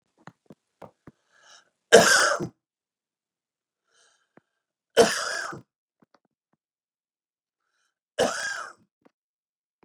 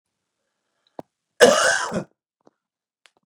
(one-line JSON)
{"three_cough_length": "9.8 s", "three_cough_amplitude": 31728, "three_cough_signal_mean_std_ratio": 0.24, "cough_length": "3.3 s", "cough_amplitude": 32236, "cough_signal_mean_std_ratio": 0.28, "survey_phase": "beta (2021-08-13 to 2022-03-07)", "age": "45-64", "gender": "Male", "wearing_mask": "No", "symptom_none": true, "smoker_status": "Never smoked", "respiratory_condition_asthma": false, "respiratory_condition_other": false, "recruitment_source": "REACT", "submission_delay": "8 days", "covid_test_result": "Negative", "covid_test_method": "RT-qPCR"}